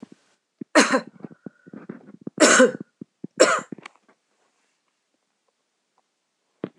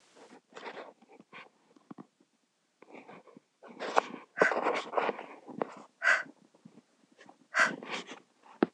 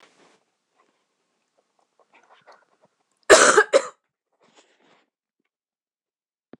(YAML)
three_cough_length: 6.8 s
three_cough_amplitude: 26027
three_cough_signal_mean_std_ratio: 0.27
exhalation_length: 8.7 s
exhalation_amplitude: 17699
exhalation_signal_mean_std_ratio: 0.34
cough_length: 6.6 s
cough_amplitude: 26028
cough_signal_mean_std_ratio: 0.19
survey_phase: alpha (2021-03-01 to 2021-08-12)
age: 45-64
gender: Female
wearing_mask: 'No'
symptom_none: true
symptom_onset: 12 days
smoker_status: Never smoked
respiratory_condition_asthma: false
respiratory_condition_other: false
recruitment_source: REACT
submission_delay: 2 days
covid_test_result: Negative
covid_test_method: RT-qPCR